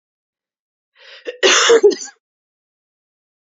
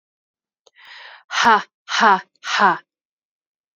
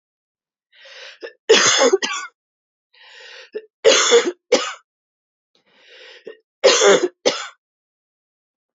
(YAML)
cough_length: 3.4 s
cough_amplitude: 29006
cough_signal_mean_std_ratio: 0.33
exhalation_length: 3.8 s
exhalation_amplitude: 30044
exhalation_signal_mean_std_ratio: 0.36
three_cough_length: 8.8 s
three_cough_amplitude: 31313
three_cough_signal_mean_std_ratio: 0.37
survey_phase: beta (2021-08-13 to 2022-03-07)
age: 18-44
gender: Female
wearing_mask: 'No'
symptom_cough_any: true
symptom_runny_or_blocked_nose: true
symptom_headache: true
symptom_change_to_sense_of_smell_or_taste: true
symptom_loss_of_taste: true
symptom_onset: 3 days
smoker_status: Never smoked
respiratory_condition_asthma: false
respiratory_condition_other: false
recruitment_source: Test and Trace
submission_delay: 2 days
covid_test_result: Positive
covid_test_method: ePCR